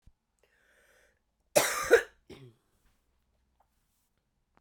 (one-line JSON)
{"cough_length": "4.6 s", "cough_amplitude": 12466, "cough_signal_mean_std_ratio": 0.21, "survey_phase": "beta (2021-08-13 to 2022-03-07)", "age": "45-64", "gender": "Female", "wearing_mask": "No", "symptom_cough_any": true, "symptom_runny_or_blocked_nose": true, "symptom_abdominal_pain": true, "symptom_fatigue": true, "symptom_headache": true, "symptom_change_to_sense_of_smell_or_taste": true, "symptom_loss_of_taste": true, "symptom_onset": "5 days", "smoker_status": "Never smoked", "respiratory_condition_asthma": false, "respiratory_condition_other": false, "recruitment_source": "Test and Trace", "submission_delay": "1 day", "covid_test_result": "Positive", "covid_test_method": "RT-qPCR", "covid_ct_value": 19.2, "covid_ct_gene": "ORF1ab gene", "covid_ct_mean": 19.7, "covid_viral_load": "340000 copies/ml", "covid_viral_load_category": "Low viral load (10K-1M copies/ml)"}